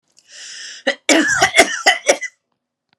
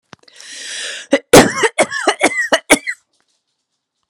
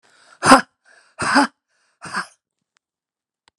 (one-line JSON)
{"three_cough_length": "3.0 s", "three_cough_amplitude": 32768, "three_cough_signal_mean_std_ratio": 0.46, "cough_length": "4.1 s", "cough_amplitude": 32768, "cough_signal_mean_std_ratio": 0.39, "exhalation_length": "3.6 s", "exhalation_amplitude": 32768, "exhalation_signal_mean_std_ratio": 0.27, "survey_phase": "beta (2021-08-13 to 2022-03-07)", "age": "45-64", "gender": "Female", "wearing_mask": "No", "symptom_none": true, "smoker_status": "Ex-smoker", "respiratory_condition_asthma": false, "respiratory_condition_other": false, "recruitment_source": "REACT", "submission_delay": "2 days", "covid_test_result": "Negative", "covid_test_method": "RT-qPCR"}